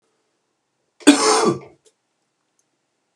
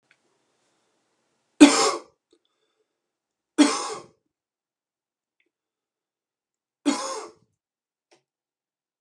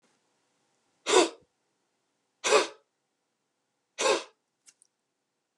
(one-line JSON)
{"cough_length": "3.2 s", "cough_amplitude": 32768, "cough_signal_mean_std_ratio": 0.3, "three_cough_length": "9.0 s", "three_cough_amplitude": 32757, "three_cough_signal_mean_std_ratio": 0.2, "exhalation_length": "5.6 s", "exhalation_amplitude": 15900, "exhalation_signal_mean_std_ratio": 0.26, "survey_phase": "alpha (2021-03-01 to 2021-08-12)", "age": "18-44", "gender": "Male", "wearing_mask": "No", "symptom_cough_any": true, "symptom_fatigue": true, "symptom_fever_high_temperature": true, "symptom_headache": true, "symptom_change_to_sense_of_smell_or_taste": true, "symptom_onset": "4 days", "smoker_status": "Ex-smoker", "respiratory_condition_asthma": false, "respiratory_condition_other": false, "recruitment_source": "Test and Trace", "submission_delay": "1 day", "covid_test_result": "Positive", "covid_test_method": "RT-qPCR", "covid_ct_value": 23.3, "covid_ct_gene": "ORF1ab gene"}